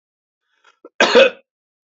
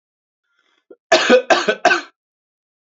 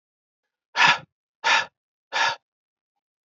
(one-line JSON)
{"cough_length": "1.9 s", "cough_amplitude": 30275, "cough_signal_mean_std_ratio": 0.3, "three_cough_length": "2.8 s", "three_cough_amplitude": 28217, "three_cough_signal_mean_std_ratio": 0.37, "exhalation_length": "3.2 s", "exhalation_amplitude": 22647, "exhalation_signal_mean_std_ratio": 0.33, "survey_phase": "beta (2021-08-13 to 2022-03-07)", "age": "18-44", "gender": "Male", "wearing_mask": "No", "symptom_cough_any": true, "symptom_runny_or_blocked_nose": true, "symptom_fatigue": true, "symptom_fever_high_temperature": true, "symptom_headache": true, "symptom_change_to_sense_of_smell_or_taste": true, "smoker_status": "Never smoked", "respiratory_condition_asthma": false, "respiratory_condition_other": false, "recruitment_source": "Test and Trace", "submission_delay": "2 days", "covid_test_result": "Positive", "covid_test_method": "RT-qPCR", "covid_ct_value": 21.0, "covid_ct_gene": "ORF1ab gene", "covid_ct_mean": 21.9, "covid_viral_load": "63000 copies/ml", "covid_viral_load_category": "Low viral load (10K-1M copies/ml)"}